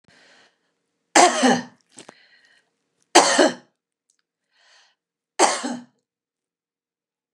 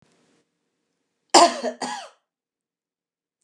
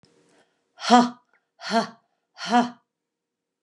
{
  "three_cough_length": "7.3 s",
  "three_cough_amplitude": 29204,
  "three_cough_signal_mean_std_ratio": 0.28,
  "cough_length": "3.4 s",
  "cough_amplitude": 29203,
  "cough_signal_mean_std_ratio": 0.23,
  "exhalation_length": "3.6 s",
  "exhalation_amplitude": 28588,
  "exhalation_signal_mean_std_ratio": 0.29,
  "survey_phase": "beta (2021-08-13 to 2022-03-07)",
  "age": "45-64",
  "gender": "Female",
  "wearing_mask": "No",
  "symptom_none": true,
  "smoker_status": "Prefer not to say",
  "respiratory_condition_asthma": false,
  "respiratory_condition_other": false,
  "recruitment_source": "REACT",
  "submission_delay": "1 day",
  "covid_test_result": "Negative",
  "covid_test_method": "RT-qPCR",
  "influenza_a_test_result": "Negative",
  "influenza_b_test_result": "Negative"
}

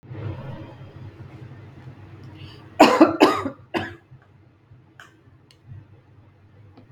{
  "cough_length": "6.9 s",
  "cough_amplitude": 32766,
  "cough_signal_mean_std_ratio": 0.3,
  "survey_phase": "beta (2021-08-13 to 2022-03-07)",
  "age": "18-44",
  "gender": "Female",
  "wearing_mask": "No",
  "symptom_runny_or_blocked_nose": true,
  "smoker_status": "Never smoked",
  "respiratory_condition_asthma": false,
  "respiratory_condition_other": false,
  "recruitment_source": "REACT",
  "submission_delay": "2 days",
  "covid_test_result": "Negative",
  "covid_test_method": "RT-qPCR",
  "influenza_a_test_result": "Negative",
  "influenza_b_test_result": "Negative"
}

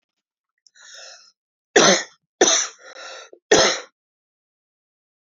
{
  "three_cough_length": "5.4 s",
  "three_cough_amplitude": 29178,
  "three_cough_signal_mean_std_ratio": 0.31,
  "survey_phase": "beta (2021-08-13 to 2022-03-07)",
  "age": "45-64",
  "gender": "Female",
  "wearing_mask": "No",
  "symptom_new_continuous_cough": true,
  "symptom_runny_or_blocked_nose": true,
  "symptom_fatigue": true,
  "symptom_headache": true,
  "symptom_change_to_sense_of_smell_or_taste": true,
  "symptom_loss_of_taste": true,
  "symptom_onset": "3 days",
  "smoker_status": "Never smoked",
  "respiratory_condition_asthma": false,
  "respiratory_condition_other": false,
  "recruitment_source": "Test and Trace",
  "submission_delay": "2 days",
  "covid_test_result": "Positive",
  "covid_test_method": "RT-qPCR"
}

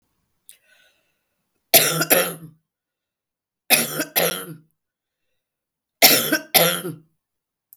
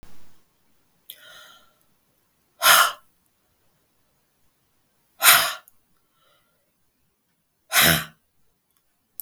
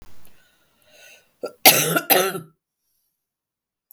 {
  "three_cough_length": "7.8 s",
  "three_cough_amplitude": 32768,
  "three_cough_signal_mean_std_ratio": 0.34,
  "exhalation_length": "9.2 s",
  "exhalation_amplitude": 32768,
  "exhalation_signal_mean_std_ratio": 0.25,
  "cough_length": "3.9 s",
  "cough_amplitude": 32768,
  "cough_signal_mean_std_ratio": 0.31,
  "survey_phase": "beta (2021-08-13 to 2022-03-07)",
  "age": "65+",
  "gender": "Female",
  "wearing_mask": "No",
  "symptom_none": true,
  "smoker_status": "Ex-smoker",
  "respiratory_condition_asthma": false,
  "respiratory_condition_other": false,
  "recruitment_source": "REACT",
  "submission_delay": "2 days",
  "covid_test_result": "Negative",
  "covid_test_method": "RT-qPCR",
  "influenza_a_test_result": "Negative",
  "influenza_b_test_result": "Negative"
}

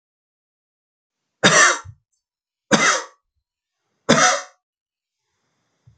{
  "three_cough_length": "6.0 s",
  "three_cough_amplitude": 32768,
  "three_cough_signal_mean_std_ratio": 0.31,
  "survey_phase": "beta (2021-08-13 to 2022-03-07)",
  "age": "45-64",
  "gender": "Male",
  "wearing_mask": "No",
  "symptom_cough_any": true,
  "symptom_runny_or_blocked_nose": true,
  "symptom_headache": true,
  "symptom_onset": "4 days",
  "smoker_status": "Never smoked",
  "respiratory_condition_asthma": false,
  "respiratory_condition_other": false,
  "recruitment_source": "Test and Trace",
  "submission_delay": "1 day",
  "covid_test_result": "Positive",
  "covid_test_method": "LAMP"
}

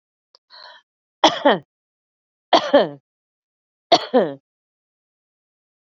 {
  "three_cough_length": "5.8 s",
  "three_cough_amplitude": 32767,
  "three_cough_signal_mean_std_ratio": 0.27,
  "survey_phase": "beta (2021-08-13 to 2022-03-07)",
  "age": "45-64",
  "gender": "Female",
  "wearing_mask": "No",
  "symptom_none": true,
  "smoker_status": "Current smoker (e-cigarettes or vapes only)",
  "respiratory_condition_asthma": false,
  "respiratory_condition_other": false,
  "recruitment_source": "REACT",
  "submission_delay": "4 days",
  "covid_test_result": "Negative",
  "covid_test_method": "RT-qPCR",
  "influenza_a_test_result": "Unknown/Void",
  "influenza_b_test_result": "Unknown/Void"
}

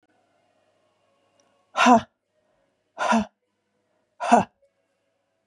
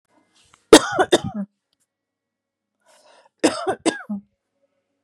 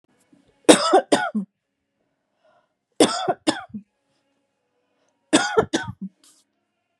{
  "exhalation_length": "5.5 s",
  "exhalation_amplitude": 27051,
  "exhalation_signal_mean_std_ratio": 0.26,
  "cough_length": "5.0 s",
  "cough_amplitude": 32768,
  "cough_signal_mean_std_ratio": 0.25,
  "three_cough_length": "7.0 s",
  "three_cough_amplitude": 32768,
  "three_cough_signal_mean_std_ratio": 0.3,
  "survey_phase": "beta (2021-08-13 to 2022-03-07)",
  "age": "45-64",
  "gender": "Female",
  "wearing_mask": "No",
  "symptom_none": true,
  "smoker_status": "Never smoked",
  "respiratory_condition_asthma": false,
  "respiratory_condition_other": false,
  "recruitment_source": "REACT",
  "submission_delay": "4 days",
  "covid_test_result": "Negative",
  "covid_test_method": "RT-qPCR",
  "influenza_a_test_result": "Unknown/Void",
  "influenza_b_test_result": "Unknown/Void"
}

